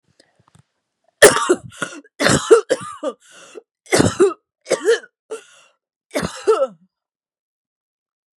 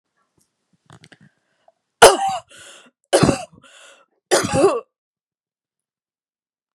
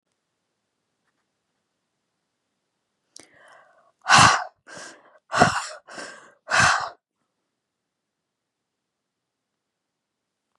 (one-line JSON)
{"cough_length": "8.4 s", "cough_amplitude": 32768, "cough_signal_mean_std_ratio": 0.35, "three_cough_length": "6.7 s", "three_cough_amplitude": 32768, "three_cough_signal_mean_std_ratio": 0.27, "exhalation_length": "10.6 s", "exhalation_amplitude": 31257, "exhalation_signal_mean_std_ratio": 0.24, "survey_phase": "beta (2021-08-13 to 2022-03-07)", "age": "45-64", "gender": "Female", "wearing_mask": "No", "symptom_new_continuous_cough": true, "symptom_runny_or_blocked_nose": true, "symptom_shortness_of_breath": true, "symptom_sore_throat": true, "symptom_abdominal_pain": true, "symptom_diarrhoea": true, "symptom_fatigue": true, "symptom_fever_high_temperature": true, "symptom_headache": true, "symptom_change_to_sense_of_smell_or_taste": true, "symptom_loss_of_taste": true, "smoker_status": "Ex-smoker", "respiratory_condition_asthma": false, "respiratory_condition_other": false, "recruitment_source": "Test and Trace", "submission_delay": "1 day", "covid_test_result": "Positive", "covid_test_method": "RT-qPCR"}